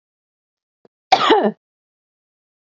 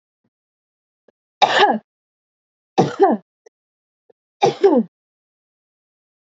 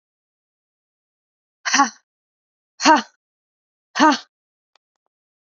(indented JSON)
{
  "cough_length": "2.7 s",
  "cough_amplitude": 28838,
  "cough_signal_mean_std_ratio": 0.28,
  "three_cough_length": "6.3 s",
  "three_cough_amplitude": 27802,
  "three_cough_signal_mean_std_ratio": 0.31,
  "exhalation_length": "5.5 s",
  "exhalation_amplitude": 28073,
  "exhalation_signal_mean_std_ratio": 0.24,
  "survey_phase": "beta (2021-08-13 to 2022-03-07)",
  "age": "18-44",
  "gender": "Female",
  "wearing_mask": "No",
  "symptom_runny_or_blocked_nose": true,
  "symptom_headache": true,
  "smoker_status": "Never smoked",
  "respiratory_condition_asthma": false,
  "respiratory_condition_other": false,
  "recruitment_source": "Test and Trace",
  "submission_delay": "2 days",
  "covid_test_result": "Positive",
  "covid_test_method": "LAMP"
}